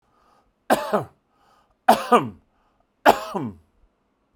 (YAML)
three_cough_length: 4.4 s
three_cough_amplitude: 32767
three_cough_signal_mean_std_ratio: 0.3
survey_phase: beta (2021-08-13 to 2022-03-07)
age: 45-64
gender: Male
wearing_mask: 'No'
symptom_none: true
symptom_onset: 12 days
smoker_status: Ex-smoker
respiratory_condition_asthma: false
respiratory_condition_other: false
recruitment_source: REACT
submission_delay: 1 day
covid_test_method: RT-qPCR